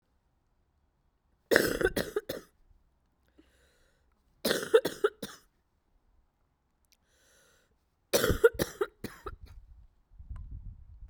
{"three_cough_length": "11.1 s", "three_cough_amplitude": 27086, "three_cough_signal_mean_std_ratio": 0.28, "survey_phase": "beta (2021-08-13 to 2022-03-07)", "age": "18-44", "gender": "Female", "wearing_mask": "No", "symptom_sore_throat": true, "symptom_fever_high_temperature": true, "smoker_status": "Never smoked", "respiratory_condition_asthma": false, "respiratory_condition_other": false, "recruitment_source": "Test and Trace", "submission_delay": "2 days", "covid_test_result": "Positive", "covid_test_method": "RT-qPCR", "covid_ct_value": 27.5, "covid_ct_gene": "ORF1ab gene", "covid_ct_mean": 28.2, "covid_viral_load": "540 copies/ml", "covid_viral_load_category": "Minimal viral load (< 10K copies/ml)"}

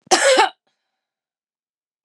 {"cough_length": "2.0 s", "cough_amplitude": 32362, "cough_signal_mean_std_ratio": 0.34, "survey_phase": "beta (2021-08-13 to 2022-03-07)", "age": "45-64", "gender": "Female", "wearing_mask": "No", "symptom_none": true, "smoker_status": "Never smoked", "respiratory_condition_asthma": false, "respiratory_condition_other": false, "recruitment_source": "REACT", "submission_delay": "1 day", "covid_test_result": "Negative", "covid_test_method": "RT-qPCR", "influenza_a_test_result": "Negative", "influenza_b_test_result": "Negative"}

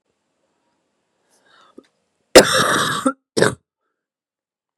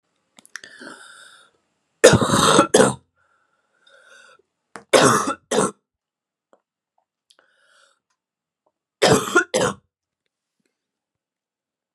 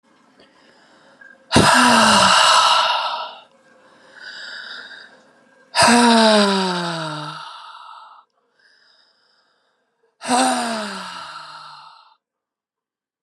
{"cough_length": "4.8 s", "cough_amplitude": 32768, "cough_signal_mean_std_ratio": 0.28, "three_cough_length": "11.9 s", "three_cough_amplitude": 32768, "three_cough_signal_mean_std_ratio": 0.3, "exhalation_length": "13.2 s", "exhalation_amplitude": 32333, "exhalation_signal_mean_std_ratio": 0.46, "survey_phase": "beta (2021-08-13 to 2022-03-07)", "age": "18-44", "gender": "Female", "wearing_mask": "No", "symptom_cough_any": true, "symptom_sore_throat": true, "symptom_fatigue": true, "symptom_headache": true, "symptom_change_to_sense_of_smell_or_taste": true, "smoker_status": "Never smoked", "respiratory_condition_asthma": false, "respiratory_condition_other": false, "recruitment_source": "Test and Trace", "submission_delay": "2 days", "covid_test_result": "Positive", "covid_test_method": "RT-qPCR", "covid_ct_value": 25.0, "covid_ct_gene": "S gene", "covid_ct_mean": 25.4, "covid_viral_load": "4700 copies/ml", "covid_viral_load_category": "Minimal viral load (< 10K copies/ml)"}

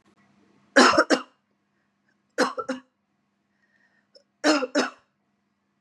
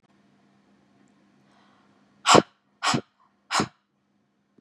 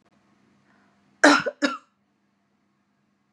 {"three_cough_length": "5.8 s", "three_cough_amplitude": 26775, "three_cough_signal_mean_std_ratio": 0.3, "exhalation_length": "4.6 s", "exhalation_amplitude": 29078, "exhalation_signal_mean_std_ratio": 0.22, "cough_length": "3.3 s", "cough_amplitude": 28217, "cough_signal_mean_std_ratio": 0.23, "survey_phase": "beta (2021-08-13 to 2022-03-07)", "age": "45-64", "gender": "Female", "wearing_mask": "No", "symptom_none": true, "smoker_status": "Never smoked", "respiratory_condition_asthma": false, "respiratory_condition_other": false, "recruitment_source": "REACT", "submission_delay": "4 days", "covid_test_result": "Negative", "covid_test_method": "RT-qPCR", "influenza_a_test_result": "Negative", "influenza_b_test_result": "Negative"}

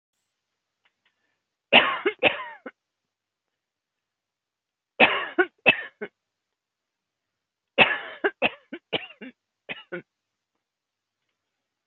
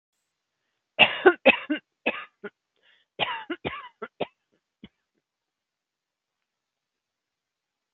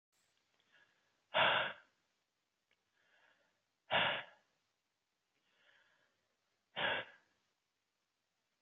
{"three_cough_length": "11.9 s", "three_cough_amplitude": 27782, "three_cough_signal_mean_std_ratio": 0.25, "cough_length": "7.9 s", "cough_amplitude": 29369, "cough_signal_mean_std_ratio": 0.22, "exhalation_length": "8.6 s", "exhalation_amplitude": 3236, "exhalation_signal_mean_std_ratio": 0.26, "survey_phase": "alpha (2021-03-01 to 2021-08-12)", "age": "65+", "gender": "Female", "wearing_mask": "No", "symptom_cough_any": true, "smoker_status": "Never smoked", "respiratory_condition_asthma": false, "respiratory_condition_other": false, "recruitment_source": "REACT", "submission_delay": "6 days", "covid_test_result": "Negative", "covid_test_method": "RT-qPCR"}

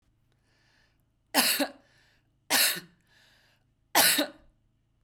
{"three_cough_length": "5.0 s", "three_cough_amplitude": 16320, "three_cough_signal_mean_std_ratio": 0.34, "survey_phase": "beta (2021-08-13 to 2022-03-07)", "age": "18-44", "gender": "Female", "wearing_mask": "No", "symptom_none": true, "smoker_status": "Never smoked", "respiratory_condition_asthma": false, "respiratory_condition_other": false, "recruitment_source": "REACT", "submission_delay": "2 days", "covid_test_result": "Negative", "covid_test_method": "RT-qPCR", "covid_ct_value": 40.0, "covid_ct_gene": "N gene"}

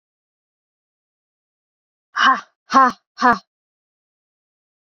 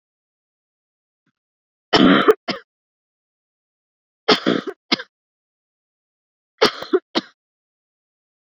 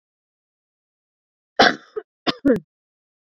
{"exhalation_length": "4.9 s", "exhalation_amplitude": 28536, "exhalation_signal_mean_std_ratio": 0.25, "three_cough_length": "8.4 s", "three_cough_amplitude": 32767, "three_cough_signal_mean_std_ratio": 0.26, "cough_length": "3.2 s", "cough_amplitude": 29721, "cough_signal_mean_std_ratio": 0.25, "survey_phase": "beta (2021-08-13 to 2022-03-07)", "age": "18-44", "gender": "Female", "wearing_mask": "No", "symptom_runny_or_blocked_nose": true, "symptom_sore_throat": true, "symptom_fever_high_temperature": true, "symptom_headache": true, "symptom_onset": "4 days", "smoker_status": "Never smoked", "respiratory_condition_asthma": false, "respiratory_condition_other": false, "recruitment_source": "Test and Trace", "submission_delay": "3 days", "covid_test_result": "Positive", "covid_test_method": "LAMP"}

